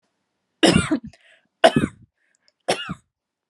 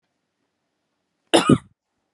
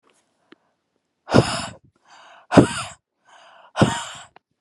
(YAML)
three_cough_length: 3.5 s
three_cough_amplitude: 28992
three_cough_signal_mean_std_ratio: 0.31
cough_length: 2.1 s
cough_amplitude: 32013
cough_signal_mean_std_ratio: 0.23
exhalation_length: 4.6 s
exhalation_amplitude: 32768
exhalation_signal_mean_std_ratio: 0.28
survey_phase: beta (2021-08-13 to 2022-03-07)
age: 18-44
gender: Female
wearing_mask: 'No'
symptom_none: true
smoker_status: Never smoked
respiratory_condition_asthma: false
respiratory_condition_other: false
recruitment_source: REACT
submission_delay: 1 day
covid_test_result: Negative
covid_test_method: RT-qPCR